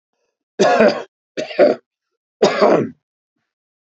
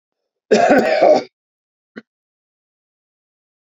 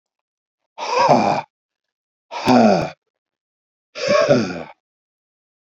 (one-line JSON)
{"three_cough_length": "3.9 s", "three_cough_amplitude": 32522, "three_cough_signal_mean_std_ratio": 0.42, "cough_length": "3.7 s", "cough_amplitude": 28754, "cough_signal_mean_std_ratio": 0.36, "exhalation_length": "5.6 s", "exhalation_amplitude": 28471, "exhalation_signal_mean_std_ratio": 0.43, "survey_phase": "beta (2021-08-13 to 2022-03-07)", "age": "65+", "gender": "Male", "wearing_mask": "No", "symptom_cough_any": true, "symptom_runny_or_blocked_nose": true, "smoker_status": "Never smoked", "respiratory_condition_asthma": false, "respiratory_condition_other": true, "recruitment_source": "REACT", "submission_delay": "2 days", "covid_test_result": "Negative", "covid_test_method": "RT-qPCR", "influenza_a_test_result": "Negative", "influenza_b_test_result": "Negative"}